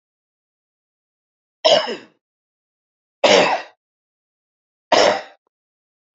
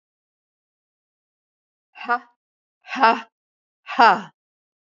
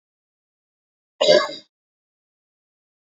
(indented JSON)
{
  "three_cough_length": "6.1 s",
  "three_cough_amplitude": 29955,
  "three_cough_signal_mean_std_ratio": 0.3,
  "exhalation_length": "4.9 s",
  "exhalation_amplitude": 32767,
  "exhalation_signal_mean_std_ratio": 0.24,
  "cough_length": "3.2 s",
  "cough_amplitude": 27938,
  "cough_signal_mean_std_ratio": 0.22,
  "survey_phase": "beta (2021-08-13 to 2022-03-07)",
  "age": "45-64",
  "gender": "Female",
  "wearing_mask": "No",
  "symptom_none": true,
  "smoker_status": "Never smoked",
  "respiratory_condition_asthma": false,
  "respiratory_condition_other": false,
  "recruitment_source": "REACT",
  "submission_delay": "6 days",
  "covid_test_result": "Negative",
  "covid_test_method": "RT-qPCR",
  "influenza_a_test_result": "Negative",
  "influenza_b_test_result": "Negative"
}